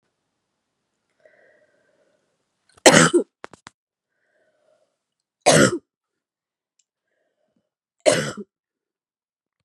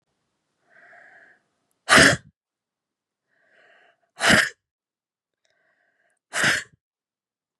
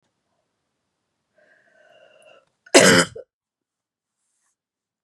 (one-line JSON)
{"three_cough_length": "9.6 s", "three_cough_amplitude": 32768, "three_cough_signal_mean_std_ratio": 0.22, "exhalation_length": "7.6 s", "exhalation_amplitude": 30107, "exhalation_signal_mean_std_ratio": 0.24, "cough_length": "5.0 s", "cough_amplitude": 32767, "cough_signal_mean_std_ratio": 0.2, "survey_phase": "beta (2021-08-13 to 2022-03-07)", "age": "18-44", "gender": "Female", "wearing_mask": "No", "symptom_cough_any": true, "symptom_runny_or_blocked_nose": true, "symptom_shortness_of_breath": true, "symptom_sore_throat": true, "symptom_abdominal_pain": true, "symptom_fatigue": true, "symptom_fever_high_temperature": true, "symptom_headache": true, "symptom_change_to_sense_of_smell_or_taste": true, "symptom_onset": "4 days", "smoker_status": "Never smoked", "respiratory_condition_asthma": false, "respiratory_condition_other": true, "recruitment_source": "Test and Trace", "submission_delay": "2 days", "covid_test_result": "Positive", "covid_test_method": "RT-qPCR", "covid_ct_value": 20.9, "covid_ct_gene": "N gene"}